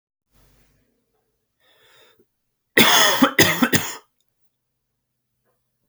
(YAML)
three_cough_length: 5.9 s
three_cough_amplitude: 32768
three_cough_signal_mean_std_ratio: 0.31
survey_phase: beta (2021-08-13 to 2022-03-07)
age: 18-44
gender: Male
wearing_mask: 'No'
symptom_cough_any: true
symptom_runny_or_blocked_nose: true
symptom_fatigue: true
symptom_other: true
smoker_status: Never smoked
respiratory_condition_asthma: false
respiratory_condition_other: false
recruitment_source: Test and Trace
submission_delay: 2 days
covid_test_result: Positive
covid_test_method: RT-qPCR
covid_ct_value: 23.9
covid_ct_gene: N gene